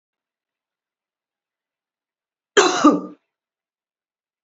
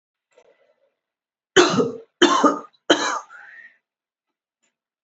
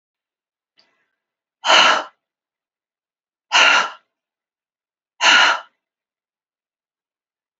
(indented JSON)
{
  "cough_length": "4.4 s",
  "cough_amplitude": 27507,
  "cough_signal_mean_std_ratio": 0.22,
  "three_cough_length": "5.0 s",
  "three_cough_amplitude": 30857,
  "three_cough_signal_mean_std_ratio": 0.33,
  "exhalation_length": "7.6 s",
  "exhalation_amplitude": 30603,
  "exhalation_signal_mean_std_ratio": 0.3,
  "survey_phase": "beta (2021-08-13 to 2022-03-07)",
  "age": "45-64",
  "gender": "Female",
  "wearing_mask": "No",
  "symptom_none": true,
  "smoker_status": "Never smoked",
  "respiratory_condition_asthma": false,
  "respiratory_condition_other": false,
  "recruitment_source": "REACT",
  "submission_delay": "7 days",
  "covid_test_result": "Negative",
  "covid_test_method": "RT-qPCR"
}